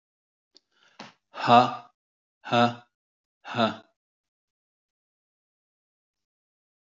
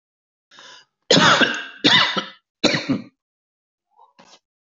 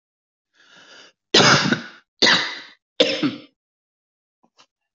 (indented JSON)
{
  "exhalation_length": "6.8 s",
  "exhalation_amplitude": 23065,
  "exhalation_signal_mean_std_ratio": 0.23,
  "three_cough_length": "4.6 s",
  "three_cough_amplitude": 28109,
  "three_cough_signal_mean_std_ratio": 0.4,
  "cough_length": "4.9 s",
  "cough_amplitude": 28079,
  "cough_signal_mean_std_ratio": 0.36,
  "survey_phase": "beta (2021-08-13 to 2022-03-07)",
  "age": "45-64",
  "gender": "Male",
  "wearing_mask": "No",
  "symptom_none": true,
  "smoker_status": "Never smoked",
  "respiratory_condition_asthma": false,
  "respiratory_condition_other": false,
  "recruitment_source": "REACT",
  "submission_delay": "2 days",
  "covid_test_result": "Negative",
  "covid_test_method": "RT-qPCR",
  "influenza_a_test_result": "Negative",
  "influenza_b_test_result": "Negative"
}